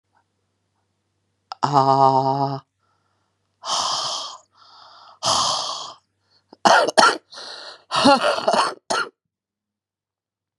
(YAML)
exhalation_length: 10.6 s
exhalation_amplitude: 32768
exhalation_signal_mean_std_ratio: 0.43
survey_phase: beta (2021-08-13 to 2022-03-07)
age: 45-64
gender: Female
wearing_mask: 'No'
symptom_cough_any: true
symptom_runny_or_blocked_nose: true
symptom_abdominal_pain: true
symptom_diarrhoea: true
symptom_fatigue: true
symptom_headache: true
symptom_loss_of_taste: true
symptom_onset: 3 days
smoker_status: Ex-smoker
respiratory_condition_asthma: false
respiratory_condition_other: false
recruitment_source: Test and Trace
submission_delay: 2 days
covid_test_result: Positive
covid_test_method: RT-qPCR
covid_ct_value: 14.9
covid_ct_gene: ORF1ab gene
covid_ct_mean: 15.2
covid_viral_load: 11000000 copies/ml
covid_viral_load_category: High viral load (>1M copies/ml)